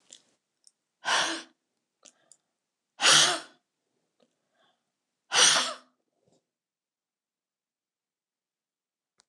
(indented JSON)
{
  "exhalation_length": "9.3 s",
  "exhalation_amplitude": 16485,
  "exhalation_signal_mean_std_ratio": 0.26,
  "survey_phase": "alpha (2021-03-01 to 2021-08-12)",
  "age": "45-64",
  "gender": "Female",
  "wearing_mask": "No",
  "symptom_none": true,
  "symptom_onset": "6 days",
  "smoker_status": "Never smoked",
  "respiratory_condition_asthma": false,
  "respiratory_condition_other": false,
  "recruitment_source": "REACT",
  "submission_delay": "1 day",
  "covid_test_result": "Negative",
  "covid_test_method": "RT-qPCR"
}